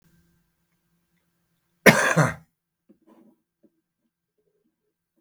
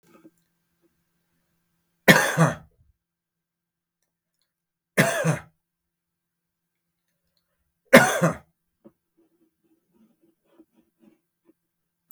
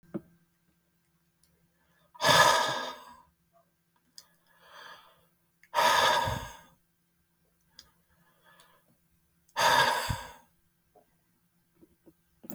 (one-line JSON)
{"cough_length": "5.2 s", "cough_amplitude": 32768, "cough_signal_mean_std_ratio": 0.2, "three_cough_length": "12.1 s", "three_cough_amplitude": 32768, "three_cough_signal_mean_std_ratio": 0.21, "exhalation_length": "12.5 s", "exhalation_amplitude": 14172, "exhalation_signal_mean_std_ratio": 0.32, "survey_phase": "beta (2021-08-13 to 2022-03-07)", "age": "65+", "gender": "Male", "wearing_mask": "No", "symptom_none": true, "smoker_status": "Never smoked", "respiratory_condition_asthma": false, "respiratory_condition_other": false, "recruitment_source": "REACT", "submission_delay": "1 day", "covid_test_result": "Negative", "covid_test_method": "RT-qPCR"}